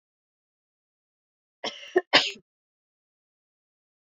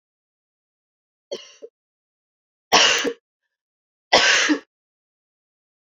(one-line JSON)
{"cough_length": "4.1 s", "cough_amplitude": 23100, "cough_signal_mean_std_ratio": 0.18, "three_cough_length": "6.0 s", "three_cough_amplitude": 30041, "three_cough_signal_mean_std_ratio": 0.3, "survey_phase": "beta (2021-08-13 to 2022-03-07)", "age": "45-64", "gender": "Female", "wearing_mask": "No", "symptom_cough_any": true, "symptom_runny_or_blocked_nose": true, "symptom_onset": "3 days", "smoker_status": "Current smoker (e-cigarettes or vapes only)", "respiratory_condition_asthma": false, "respiratory_condition_other": false, "recruitment_source": "Test and Trace", "submission_delay": "2 days", "covid_test_result": "Positive", "covid_test_method": "RT-qPCR", "covid_ct_value": 16.6, "covid_ct_gene": "ORF1ab gene", "covid_ct_mean": 17.0, "covid_viral_load": "2600000 copies/ml", "covid_viral_load_category": "High viral load (>1M copies/ml)"}